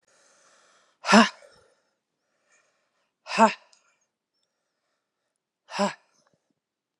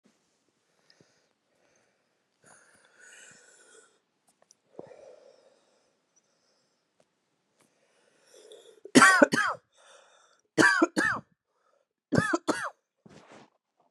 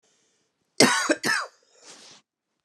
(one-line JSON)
{"exhalation_length": "7.0 s", "exhalation_amplitude": 25661, "exhalation_signal_mean_std_ratio": 0.2, "three_cough_length": "13.9 s", "three_cough_amplitude": 24108, "three_cough_signal_mean_std_ratio": 0.23, "cough_length": "2.6 s", "cough_amplitude": 29612, "cough_signal_mean_std_ratio": 0.34, "survey_phase": "beta (2021-08-13 to 2022-03-07)", "age": "45-64", "gender": "Female", "wearing_mask": "No", "symptom_cough_any": true, "symptom_runny_or_blocked_nose": true, "symptom_fatigue": true, "smoker_status": "Never smoked", "respiratory_condition_asthma": false, "respiratory_condition_other": false, "recruitment_source": "Test and Trace", "submission_delay": "1 day", "covid_test_result": "Positive", "covid_test_method": "RT-qPCR", "covid_ct_value": 21.8, "covid_ct_gene": "ORF1ab gene", "covid_ct_mean": 22.4, "covid_viral_load": "44000 copies/ml", "covid_viral_load_category": "Low viral load (10K-1M copies/ml)"}